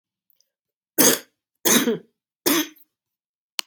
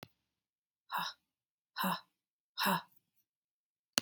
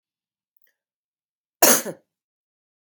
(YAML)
three_cough_length: 3.7 s
three_cough_amplitude: 30837
three_cough_signal_mean_std_ratio: 0.34
exhalation_length: 4.0 s
exhalation_amplitude: 11096
exhalation_signal_mean_std_ratio: 0.3
cough_length: 2.8 s
cough_amplitude: 32768
cough_signal_mean_std_ratio: 0.2
survey_phase: beta (2021-08-13 to 2022-03-07)
age: 45-64
gender: Female
wearing_mask: 'No'
symptom_fatigue: true
symptom_fever_high_temperature: true
symptom_headache: true
symptom_onset: 2 days
smoker_status: Never smoked
respiratory_condition_asthma: false
respiratory_condition_other: false
recruitment_source: Test and Trace
submission_delay: 2 days
covid_test_result: Positive
covid_test_method: RT-qPCR
covid_ct_value: 16.3
covid_ct_gene: ORF1ab gene
covid_ct_mean: 16.6
covid_viral_load: 3700000 copies/ml
covid_viral_load_category: High viral load (>1M copies/ml)